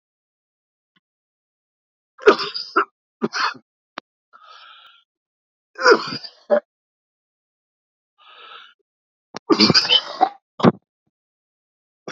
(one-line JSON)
{"three_cough_length": "12.1 s", "three_cough_amplitude": 31137, "three_cough_signal_mean_std_ratio": 0.27, "survey_phase": "beta (2021-08-13 to 2022-03-07)", "age": "45-64", "gender": "Male", "wearing_mask": "No", "symptom_cough_any": true, "symptom_new_continuous_cough": true, "symptom_headache": true, "symptom_loss_of_taste": true, "smoker_status": "Never smoked", "respiratory_condition_asthma": false, "respiratory_condition_other": false, "recruitment_source": "Test and Trace", "submission_delay": "2 days", "covid_test_result": "Positive", "covid_test_method": "RT-qPCR", "covid_ct_value": 32.4, "covid_ct_gene": "ORF1ab gene", "covid_ct_mean": 33.6, "covid_viral_load": "9.7 copies/ml", "covid_viral_load_category": "Minimal viral load (< 10K copies/ml)"}